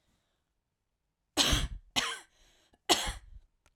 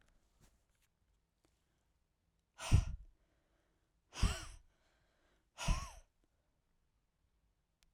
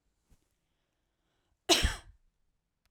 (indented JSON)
{
  "three_cough_length": "3.8 s",
  "three_cough_amplitude": 11570,
  "three_cough_signal_mean_std_ratio": 0.35,
  "exhalation_length": "7.9 s",
  "exhalation_amplitude": 4423,
  "exhalation_signal_mean_std_ratio": 0.22,
  "cough_length": "2.9 s",
  "cough_amplitude": 10032,
  "cough_signal_mean_std_ratio": 0.22,
  "survey_phase": "beta (2021-08-13 to 2022-03-07)",
  "age": "45-64",
  "gender": "Female",
  "wearing_mask": "No",
  "symptom_cough_any": true,
  "symptom_shortness_of_breath": true,
  "symptom_abdominal_pain": true,
  "symptom_fatigue": true,
  "symptom_fever_high_temperature": true,
  "symptom_headache": true,
  "symptom_change_to_sense_of_smell_or_taste": true,
  "symptom_onset": "4 days",
  "smoker_status": "Ex-smoker",
  "respiratory_condition_asthma": false,
  "respiratory_condition_other": false,
  "recruitment_source": "Test and Trace",
  "submission_delay": "1 day",
  "covid_test_result": "Positive",
  "covid_test_method": "RT-qPCR",
  "covid_ct_value": 27.3,
  "covid_ct_gene": "N gene"
}